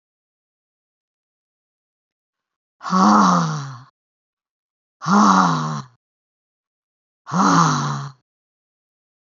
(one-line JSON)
{"exhalation_length": "9.4 s", "exhalation_amplitude": 26902, "exhalation_signal_mean_std_ratio": 0.39, "survey_phase": "beta (2021-08-13 to 2022-03-07)", "age": "65+", "gender": "Female", "wearing_mask": "No", "symptom_cough_any": true, "symptom_runny_or_blocked_nose": true, "smoker_status": "Never smoked", "respiratory_condition_asthma": false, "respiratory_condition_other": false, "recruitment_source": "REACT", "submission_delay": "2 days", "covid_test_result": "Negative", "covid_test_method": "RT-qPCR", "influenza_a_test_result": "Negative", "influenza_b_test_result": "Negative"}